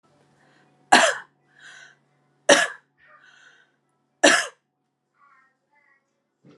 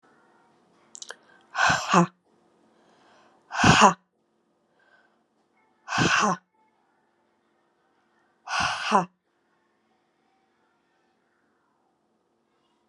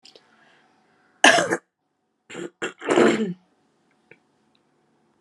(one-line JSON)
{"three_cough_length": "6.6 s", "three_cough_amplitude": 32767, "three_cough_signal_mean_std_ratio": 0.24, "exhalation_length": "12.9 s", "exhalation_amplitude": 29654, "exhalation_signal_mean_std_ratio": 0.28, "cough_length": "5.2 s", "cough_amplitude": 32745, "cough_signal_mean_std_ratio": 0.3, "survey_phase": "alpha (2021-03-01 to 2021-08-12)", "age": "18-44", "gender": "Female", "wearing_mask": "No", "symptom_cough_any": true, "symptom_shortness_of_breath": true, "symptom_fatigue": true, "symptom_change_to_sense_of_smell_or_taste": true, "symptom_loss_of_taste": true, "symptom_onset": "9 days", "smoker_status": "Ex-smoker", "respiratory_condition_asthma": false, "respiratory_condition_other": false, "recruitment_source": "Test and Trace", "submission_delay": "1 day", "covid_test_result": "Positive", "covid_test_method": "RT-qPCR", "covid_ct_value": 23.3, "covid_ct_gene": "ORF1ab gene", "covid_ct_mean": 23.9, "covid_viral_load": "14000 copies/ml", "covid_viral_load_category": "Low viral load (10K-1M copies/ml)"}